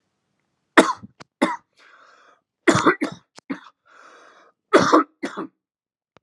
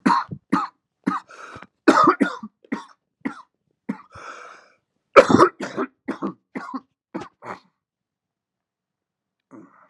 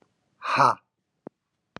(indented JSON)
{
  "three_cough_length": "6.2 s",
  "three_cough_amplitude": 32768,
  "three_cough_signal_mean_std_ratio": 0.3,
  "cough_length": "9.9 s",
  "cough_amplitude": 32768,
  "cough_signal_mean_std_ratio": 0.29,
  "exhalation_length": "1.8 s",
  "exhalation_amplitude": 18224,
  "exhalation_signal_mean_std_ratio": 0.3,
  "survey_phase": "alpha (2021-03-01 to 2021-08-12)",
  "age": "18-44",
  "gender": "Male",
  "wearing_mask": "No",
  "symptom_cough_any": true,
  "symptom_fatigue": true,
  "symptom_change_to_sense_of_smell_or_taste": true,
  "symptom_loss_of_taste": true,
  "symptom_onset": "6 days",
  "smoker_status": "Never smoked",
  "respiratory_condition_asthma": false,
  "respiratory_condition_other": false,
  "recruitment_source": "Test and Trace",
  "submission_delay": "2 days",
  "covid_test_result": "Positive",
  "covid_test_method": "RT-qPCR",
  "covid_ct_value": 21.1,
  "covid_ct_gene": "ORF1ab gene",
  "covid_ct_mean": 21.8,
  "covid_viral_load": "69000 copies/ml",
  "covid_viral_load_category": "Low viral load (10K-1M copies/ml)"
}